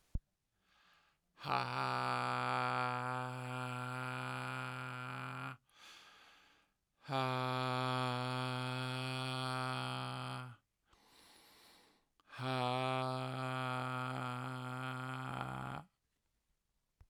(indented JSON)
{
  "exhalation_length": "17.1 s",
  "exhalation_amplitude": 3754,
  "exhalation_signal_mean_std_ratio": 0.72,
  "survey_phase": "alpha (2021-03-01 to 2021-08-12)",
  "age": "45-64",
  "gender": "Male",
  "wearing_mask": "No",
  "symptom_none": true,
  "smoker_status": "Ex-smoker",
  "respiratory_condition_asthma": false,
  "respiratory_condition_other": false,
  "recruitment_source": "REACT",
  "submission_delay": "2 days",
  "covid_test_result": "Negative",
  "covid_test_method": "RT-qPCR"
}